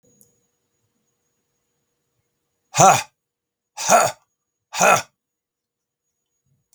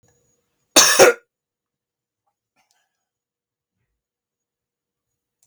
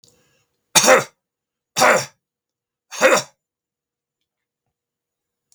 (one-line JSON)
{"exhalation_length": "6.7 s", "exhalation_amplitude": 32768, "exhalation_signal_mean_std_ratio": 0.26, "cough_length": "5.5 s", "cough_amplitude": 32768, "cough_signal_mean_std_ratio": 0.2, "three_cough_length": "5.5 s", "three_cough_amplitude": 32768, "three_cough_signal_mean_std_ratio": 0.28, "survey_phase": "beta (2021-08-13 to 2022-03-07)", "age": "65+", "gender": "Male", "wearing_mask": "No", "symptom_shortness_of_breath": true, "smoker_status": "Never smoked", "respiratory_condition_asthma": false, "respiratory_condition_other": false, "recruitment_source": "REACT", "submission_delay": "6 days", "covid_test_result": "Negative", "covid_test_method": "RT-qPCR", "influenza_a_test_result": "Negative", "influenza_b_test_result": "Negative"}